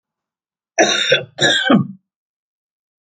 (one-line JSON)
{"cough_length": "3.1 s", "cough_amplitude": 31190, "cough_signal_mean_std_ratio": 0.44, "survey_phase": "alpha (2021-03-01 to 2021-08-12)", "age": "65+", "gender": "Female", "wearing_mask": "No", "symptom_none": true, "smoker_status": "Never smoked", "respiratory_condition_asthma": true, "respiratory_condition_other": false, "recruitment_source": "REACT", "submission_delay": "1 day", "covid_test_result": "Negative", "covid_test_method": "RT-qPCR"}